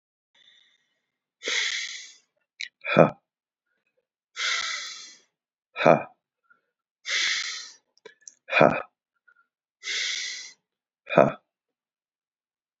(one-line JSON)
{"exhalation_length": "12.8 s", "exhalation_amplitude": 31791, "exhalation_signal_mean_std_ratio": 0.3, "survey_phase": "beta (2021-08-13 to 2022-03-07)", "age": "45-64", "gender": "Male", "wearing_mask": "No", "symptom_cough_any": true, "symptom_runny_or_blocked_nose": true, "symptom_headache": true, "smoker_status": "Ex-smoker", "respiratory_condition_asthma": false, "respiratory_condition_other": true, "recruitment_source": "Test and Trace", "submission_delay": "1 day", "covid_test_result": "Positive", "covid_test_method": "RT-qPCR", "covid_ct_value": 16.8, "covid_ct_gene": "ORF1ab gene", "covid_ct_mean": 17.4, "covid_viral_load": "1900000 copies/ml", "covid_viral_load_category": "High viral load (>1M copies/ml)"}